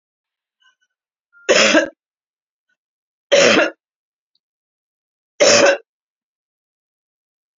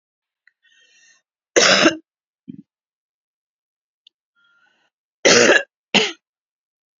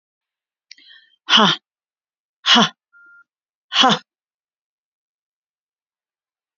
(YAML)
three_cough_length: 7.6 s
three_cough_amplitude: 32768
three_cough_signal_mean_std_ratio: 0.31
cough_length: 7.0 s
cough_amplitude: 32768
cough_signal_mean_std_ratio: 0.28
exhalation_length: 6.6 s
exhalation_amplitude: 32767
exhalation_signal_mean_std_ratio: 0.26
survey_phase: beta (2021-08-13 to 2022-03-07)
age: 65+
gender: Female
wearing_mask: 'No'
symptom_cough_any: true
symptom_fatigue: true
symptom_other: true
symptom_onset: 12 days
smoker_status: Never smoked
respiratory_condition_asthma: false
respiratory_condition_other: false
recruitment_source: REACT
submission_delay: 3 days
covid_test_result: Negative
covid_test_method: RT-qPCR
influenza_a_test_result: Negative
influenza_b_test_result: Negative